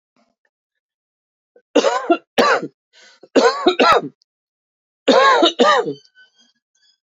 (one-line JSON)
{"three_cough_length": "7.2 s", "three_cough_amplitude": 31996, "three_cough_signal_mean_std_ratio": 0.43, "survey_phase": "beta (2021-08-13 to 2022-03-07)", "age": "45-64", "gender": "Female", "wearing_mask": "No", "symptom_runny_or_blocked_nose": true, "symptom_fatigue": true, "symptom_headache": true, "symptom_onset": "4 days", "smoker_status": "Ex-smoker", "respiratory_condition_asthma": true, "respiratory_condition_other": false, "recruitment_source": "Test and Trace", "submission_delay": "1 day", "covid_test_result": "Positive", "covid_test_method": "RT-qPCR", "covid_ct_value": 18.9, "covid_ct_gene": "ORF1ab gene", "covid_ct_mean": 19.2, "covid_viral_load": "500000 copies/ml", "covid_viral_load_category": "Low viral load (10K-1M copies/ml)"}